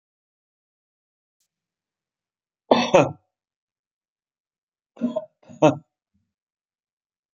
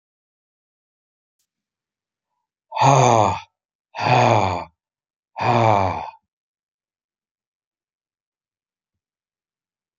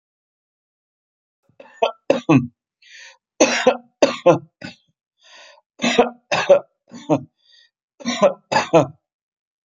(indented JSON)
{
  "three_cough_length": "7.3 s",
  "three_cough_amplitude": 28736,
  "three_cough_signal_mean_std_ratio": 0.2,
  "exhalation_length": "10.0 s",
  "exhalation_amplitude": 32585,
  "exhalation_signal_mean_std_ratio": 0.32,
  "cough_length": "9.6 s",
  "cough_amplitude": 31649,
  "cough_signal_mean_std_ratio": 0.35,
  "survey_phase": "beta (2021-08-13 to 2022-03-07)",
  "age": "65+",
  "gender": "Male",
  "wearing_mask": "No",
  "symptom_none": true,
  "smoker_status": "Never smoked",
  "respiratory_condition_asthma": false,
  "respiratory_condition_other": false,
  "recruitment_source": "REACT",
  "submission_delay": "2 days",
  "covid_test_result": "Negative",
  "covid_test_method": "RT-qPCR",
  "influenza_a_test_result": "Negative",
  "influenza_b_test_result": "Negative"
}